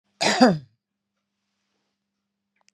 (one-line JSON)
{"cough_length": "2.7 s", "cough_amplitude": 27681, "cough_signal_mean_std_ratio": 0.27, "survey_phase": "beta (2021-08-13 to 2022-03-07)", "age": "65+", "gender": "Male", "wearing_mask": "No", "symptom_none": true, "smoker_status": "Never smoked", "respiratory_condition_asthma": false, "respiratory_condition_other": false, "recruitment_source": "REACT", "submission_delay": "2 days", "covid_test_result": "Negative", "covid_test_method": "RT-qPCR", "influenza_a_test_result": "Negative", "influenza_b_test_result": "Negative"}